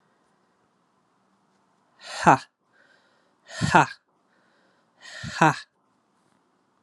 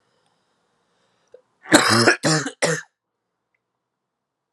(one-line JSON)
{"exhalation_length": "6.8 s", "exhalation_amplitude": 32427, "exhalation_signal_mean_std_ratio": 0.21, "cough_length": "4.5 s", "cough_amplitude": 32767, "cough_signal_mean_std_ratio": 0.33, "survey_phase": "alpha (2021-03-01 to 2021-08-12)", "age": "18-44", "gender": "Male", "wearing_mask": "No", "symptom_new_continuous_cough": true, "symptom_shortness_of_breath": true, "symptom_fatigue": true, "symptom_fever_high_temperature": true, "symptom_headache": true, "symptom_onset": "3 days", "smoker_status": "Never smoked", "respiratory_condition_asthma": true, "respiratory_condition_other": false, "recruitment_source": "Test and Trace", "submission_delay": "3 days", "covid_test_result": "Positive", "covid_test_method": "RT-qPCR", "covid_ct_value": 20.1, "covid_ct_gene": "ORF1ab gene", "covid_ct_mean": 20.5, "covid_viral_load": "190000 copies/ml", "covid_viral_load_category": "Low viral load (10K-1M copies/ml)"}